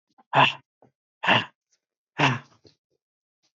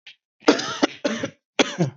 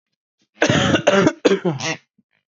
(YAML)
exhalation_length: 3.6 s
exhalation_amplitude: 18943
exhalation_signal_mean_std_ratio: 0.3
three_cough_length: 2.0 s
three_cough_amplitude: 27097
three_cough_signal_mean_std_ratio: 0.44
cough_length: 2.5 s
cough_amplitude: 27623
cough_signal_mean_std_ratio: 0.53
survey_phase: beta (2021-08-13 to 2022-03-07)
age: 18-44
gender: Male
wearing_mask: 'No'
symptom_cough_any: true
smoker_status: Never smoked
respiratory_condition_asthma: false
respiratory_condition_other: false
recruitment_source: REACT
submission_delay: 1 day
covid_test_result: Negative
covid_test_method: RT-qPCR
influenza_a_test_result: Negative
influenza_b_test_result: Negative